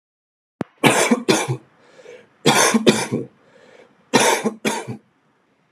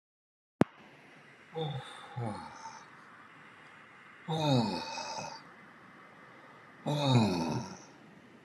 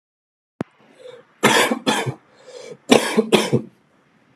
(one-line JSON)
{"three_cough_length": "5.7 s", "three_cough_amplitude": 32768, "three_cough_signal_mean_std_ratio": 0.46, "exhalation_length": "8.4 s", "exhalation_amplitude": 14215, "exhalation_signal_mean_std_ratio": 0.45, "cough_length": "4.4 s", "cough_amplitude": 32768, "cough_signal_mean_std_ratio": 0.4, "survey_phase": "alpha (2021-03-01 to 2021-08-12)", "age": "18-44", "gender": "Male", "wearing_mask": "No", "symptom_none": true, "smoker_status": "Never smoked", "respiratory_condition_asthma": false, "respiratory_condition_other": false, "recruitment_source": "REACT", "submission_delay": "16 days", "covid_test_result": "Negative", "covid_test_method": "RT-qPCR"}